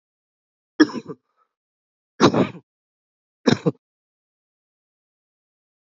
{"three_cough_length": "5.8 s", "three_cough_amplitude": 28573, "three_cough_signal_mean_std_ratio": 0.21, "survey_phase": "beta (2021-08-13 to 2022-03-07)", "age": "18-44", "gender": "Male", "wearing_mask": "No", "symptom_fatigue": true, "smoker_status": "Never smoked", "respiratory_condition_asthma": false, "respiratory_condition_other": false, "recruitment_source": "Test and Trace", "submission_delay": "1 day", "covid_test_result": "Positive", "covid_test_method": "RT-qPCR", "covid_ct_value": 21.2, "covid_ct_gene": "N gene"}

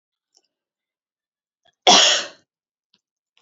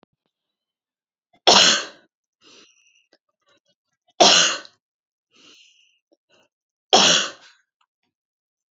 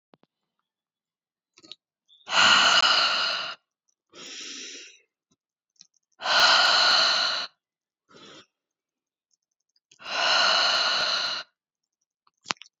{"cough_length": "3.4 s", "cough_amplitude": 30291, "cough_signal_mean_std_ratio": 0.25, "three_cough_length": "8.7 s", "three_cough_amplitude": 32283, "three_cough_signal_mean_std_ratio": 0.27, "exhalation_length": "12.8 s", "exhalation_amplitude": 25789, "exhalation_signal_mean_std_ratio": 0.45, "survey_phase": "beta (2021-08-13 to 2022-03-07)", "age": "18-44", "gender": "Female", "wearing_mask": "No", "symptom_fatigue": true, "symptom_headache": true, "symptom_onset": "10 days", "smoker_status": "Never smoked", "respiratory_condition_asthma": true, "respiratory_condition_other": false, "recruitment_source": "REACT", "submission_delay": "1 day", "covid_test_result": "Negative", "covid_test_method": "RT-qPCR", "influenza_a_test_result": "Negative", "influenza_b_test_result": "Negative"}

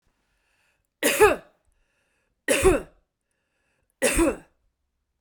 {"three_cough_length": "5.2 s", "three_cough_amplitude": 21310, "three_cough_signal_mean_std_ratio": 0.33, "survey_phase": "beta (2021-08-13 to 2022-03-07)", "age": "45-64", "gender": "Female", "wearing_mask": "No", "symptom_none": true, "smoker_status": "Never smoked", "respiratory_condition_asthma": false, "respiratory_condition_other": false, "recruitment_source": "REACT", "submission_delay": "1 day", "covid_test_result": "Negative", "covid_test_method": "RT-qPCR"}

